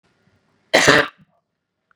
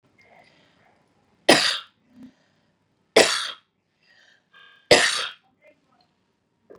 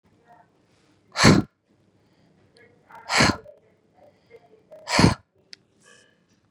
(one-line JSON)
{"cough_length": "2.0 s", "cough_amplitude": 32768, "cough_signal_mean_std_ratio": 0.3, "three_cough_length": "6.8 s", "three_cough_amplitude": 32767, "three_cough_signal_mean_std_ratio": 0.26, "exhalation_length": "6.5 s", "exhalation_amplitude": 31768, "exhalation_signal_mean_std_ratio": 0.26, "survey_phase": "beta (2021-08-13 to 2022-03-07)", "age": "45-64", "gender": "Female", "wearing_mask": "No", "symptom_none": true, "smoker_status": "Never smoked", "respiratory_condition_asthma": false, "respiratory_condition_other": false, "recruitment_source": "REACT", "submission_delay": "11 days", "covid_test_result": "Negative", "covid_test_method": "RT-qPCR", "influenza_a_test_result": "Negative", "influenza_b_test_result": "Negative"}